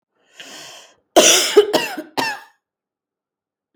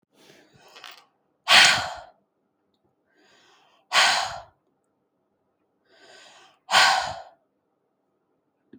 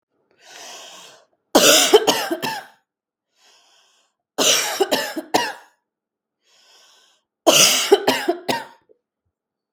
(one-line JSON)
{"cough_length": "3.8 s", "cough_amplitude": 32768, "cough_signal_mean_std_ratio": 0.36, "exhalation_length": "8.8 s", "exhalation_amplitude": 26917, "exhalation_signal_mean_std_ratio": 0.29, "three_cough_length": "9.7 s", "three_cough_amplitude": 32768, "three_cough_signal_mean_std_ratio": 0.39, "survey_phase": "beta (2021-08-13 to 2022-03-07)", "age": "45-64", "gender": "Female", "wearing_mask": "No", "symptom_none": true, "smoker_status": "Never smoked", "respiratory_condition_asthma": false, "respiratory_condition_other": false, "recruitment_source": "REACT", "submission_delay": "2 days", "covid_test_result": "Negative", "covid_test_method": "RT-qPCR", "influenza_a_test_result": "Negative", "influenza_b_test_result": "Negative"}